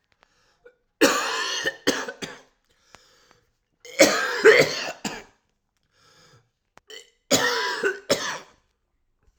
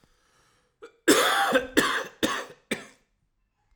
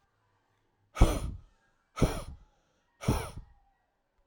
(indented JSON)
{
  "three_cough_length": "9.4 s",
  "three_cough_amplitude": 29753,
  "three_cough_signal_mean_std_ratio": 0.38,
  "cough_length": "3.8 s",
  "cough_amplitude": 18034,
  "cough_signal_mean_std_ratio": 0.43,
  "exhalation_length": "4.3 s",
  "exhalation_amplitude": 14770,
  "exhalation_signal_mean_std_ratio": 0.29,
  "survey_phase": "alpha (2021-03-01 to 2021-08-12)",
  "age": "18-44",
  "gender": "Male",
  "wearing_mask": "No",
  "symptom_none": true,
  "smoker_status": "Ex-smoker",
  "respiratory_condition_asthma": true,
  "respiratory_condition_other": false,
  "recruitment_source": "REACT",
  "submission_delay": "1 day",
  "covid_test_result": "Negative",
  "covid_test_method": "RT-qPCR"
}